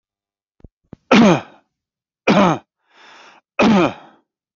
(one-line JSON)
{"three_cough_length": "4.6 s", "three_cough_amplitude": 32768, "three_cough_signal_mean_std_ratio": 0.38, "survey_phase": "beta (2021-08-13 to 2022-03-07)", "age": "45-64", "gender": "Male", "wearing_mask": "No", "symptom_none": true, "smoker_status": "Never smoked", "respiratory_condition_asthma": true, "respiratory_condition_other": false, "recruitment_source": "REACT", "submission_delay": "1 day", "covid_test_result": "Negative", "covid_test_method": "RT-qPCR"}